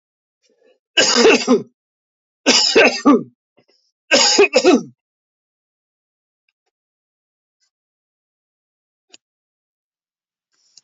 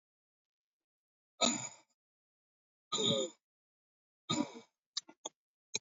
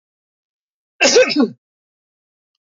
{
  "three_cough_length": "10.8 s",
  "three_cough_amplitude": 30449,
  "three_cough_signal_mean_std_ratio": 0.33,
  "exhalation_length": "5.8 s",
  "exhalation_amplitude": 4780,
  "exhalation_signal_mean_std_ratio": 0.3,
  "cough_length": "2.7 s",
  "cough_amplitude": 31796,
  "cough_signal_mean_std_ratio": 0.32,
  "survey_phase": "beta (2021-08-13 to 2022-03-07)",
  "age": "45-64",
  "gender": "Male",
  "wearing_mask": "No",
  "symptom_runny_or_blocked_nose": true,
  "symptom_headache": true,
  "smoker_status": "Never smoked",
  "respiratory_condition_asthma": true,
  "respiratory_condition_other": false,
  "recruitment_source": "Test and Trace",
  "submission_delay": "1 day",
  "covid_test_result": "Positive",
  "covid_test_method": "RT-qPCR",
  "covid_ct_value": 36.1,
  "covid_ct_gene": "N gene"
}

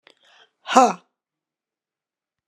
{
  "exhalation_length": "2.5 s",
  "exhalation_amplitude": 32756,
  "exhalation_signal_mean_std_ratio": 0.21,
  "survey_phase": "alpha (2021-03-01 to 2021-08-12)",
  "age": "65+",
  "gender": "Female",
  "wearing_mask": "No",
  "symptom_none": true,
  "smoker_status": "Ex-smoker",
  "respiratory_condition_asthma": true,
  "respiratory_condition_other": false,
  "recruitment_source": "REACT",
  "submission_delay": "3 days",
  "covid_test_result": "Negative",
  "covid_test_method": "RT-qPCR"
}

